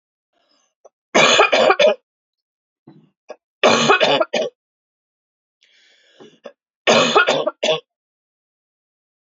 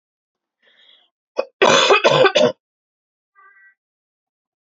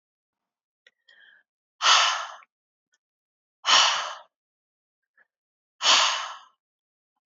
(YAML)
three_cough_length: 9.3 s
three_cough_amplitude: 29552
three_cough_signal_mean_std_ratio: 0.39
cough_length: 4.6 s
cough_amplitude: 32768
cough_signal_mean_std_ratio: 0.35
exhalation_length: 7.3 s
exhalation_amplitude: 19191
exhalation_signal_mean_std_ratio: 0.32
survey_phase: alpha (2021-03-01 to 2021-08-12)
age: 18-44
gender: Female
wearing_mask: 'No'
symptom_cough_any: true
symptom_fatigue: true
symptom_headache: true
symptom_onset: 3 days
smoker_status: Never smoked
respiratory_condition_asthma: false
respiratory_condition_other: false
recruitment_source: Test and Trace
submission_delay: 2 days
covid_test_result: Positive
covid_test_method: RT-qPCR
covid_ct_value: 26.3
covid_ct_gene: ORF1ab gene
covid_ct_mean: 27.1
covid_viral_load: 1300 copies/ml
covid_viral_load_category: Minimal viral load (< 10K copies/ml)